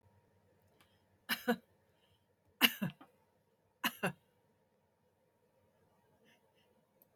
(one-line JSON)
{"three_cough_length": "7.2 s", "three_cough_amplitude": 8467, "three_cough_signal_mean_std_ratio": 0.21, "survey_phase": "alpha (2021-03-01 to 2021-08-12)", "age": "65+", "gender": "Female", "wearing_mask": "No", "symptom_none": true, "symptom_onset": "6 days", "smoker_status": "Never smoked", "respiratory_condition_asthma": false, "respiratory_condition_other": false, "recruitment_source": "REACT", "submission_delay": "1 day", "covid_test_result": "Negative", "covid_test_method": "RT-qPCR"}